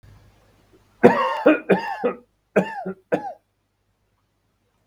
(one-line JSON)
{"three_cough_length": "4.9 s", "three_cough_amplitude": 32768, "three_cough_signal_mean_std_ratio": 0.35, "survey_phase": "beta (2021-08-13 to 2022-03-07)", "age": "65+", "gender": "Male", "wearing_mask": "No", "symptom_none": true, "smoker_status": "Ex-smoker", "respiratory_condition_asthma": false, "respiratory_condition_other": true, "recruitment_source": "REACT", "submission_delay": "20 days", "covid_test_result": "Negative", "covid_test_method": "RT-qPCR", "influenza_a_test_result": "Unknown/Void", "influenza_b_test_result": "Unknown/Void"}